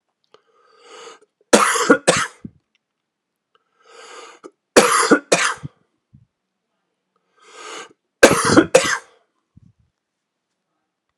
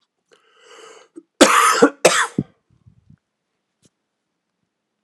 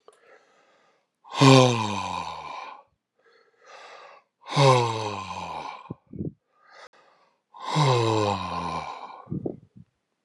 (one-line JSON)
{"three_cough_length": "11.2 s", "three_cough_amplitude": 32768, "three_cough_signal_mean_std_ratio": 0.3, "cough_length": "5.0 s", "cough_amplitude": 32768, "cough_signal_mean_std_ratio": 0.29, "exhalation_length": "10.2 s", "exhalation_amplitude": 28417, "exhalation_signal_mean_std_ratio": 0.41, "survey_phase": "alpha (2021-03-01 to 2021-08-12)", "age": "45-64", "gender": "Male", "wearing_mask": "No", "symptom_cough_any": true, "symptom_onset": "4 days", "smoker_status": "Never smoked", "respiratory_condition_asthma": false, "respiratory_condition_other": false, "recruitment_source": "Test and Trace", "submission_delay": "2 days", "covid_test_result": "Positive", "covid_test_method": "ePCR"}